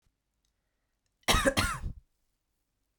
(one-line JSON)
{"cough_length": "3.0 s", "cough_amplitude": 8965, "cough_signal_mean_std_ratio": 0.32, "survey_phase": "beta (2021-08-13 to 2022-03-07)", "age": "45-64", "gender": "Female", "wearing_mask": "No", "symptom_none": true, "smoker_status": "Never smoked", "respiratory_condition_asthma": false, "respiratory_condition_other": false, "recruitment_source": "REACT", "submission_delay": "2 days", "covid_test_result": "Negative", "covid_test_method": "RT-qPCR", "influenza_a_test_result": "Unknown/Void", "influenza_b_test_result": "Unknown/Void"}